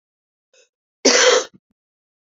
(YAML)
cough_length: 2.4 s
cough_amplitude: 29442
cough_signal_mean_std_ratio: 0.33
survey_phase: alpha (2021-03-01 to 2021-08-12)
age: 45-64
gender: Female
wearing_mask: 'No'
symptom_shortness_of_breath: true
symptom_fatigue: true
symptom_headache: true
symptom_change_to_sense_of_smell_or_taste: true
symptom_loss_of_taste: true
symptom_onset: 3 days
smoker_status: Ex-smoker
respiratory_condition_asthma: true
respiratory_condition_other: false
recruitment_source: Test and Trace
submission_delay: 2 days
covid_test_result: Positive
covid_test_method: RT-qPCR
covid_ct_value: 14.9
covid_ct_gene: S gene
covid_ct_mean: 15.0
covid_viral_load: 12000000 copies/ml
covid_viral_load_category: High viral load (>1M copies/ml)